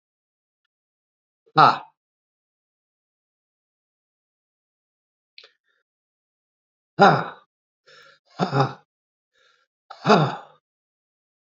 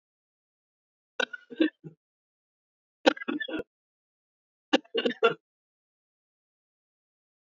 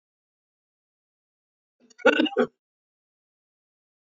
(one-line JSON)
{"exhalation_length": "11.5 s", "exhalation_amplitude": 27776, "exhalation_signal_mean_std_ratio": 0.21, "three_cough_length": "7.6 s", "three_cough_amplitude": 18194, "three_cough_signal_mean_std_ratio": 0.22, "cough_length": "4.2 s", "cough_amplitude": 18010, "cough_signal_mean_std_ratio": 0.21, "survey_phase": "beta (2021-08-13 to 2022-03-07)", "age": "45-64", "gender": "Male", "wearing_mask": "No", "symptom_cough_any": true, "symptom_runny_or_blocked_nose": true, "symptom_shortness_of_breath": true, "symptom_diarrhoea": true, "symptom_fatigue": true, "symptom_fever_high_temperature": true, "symptom_loss_of_taste": true, "symptom_onset": "5 days", "smoker_status": "Ex-smoker", "respiratory_condition_asthma": false, "respiratory_condition_other": false, "recruitment_source": "Test and Trace", "submission_delay": "2 days", "covid_test_result": "Positive", "covid_test_method": "ePCR"}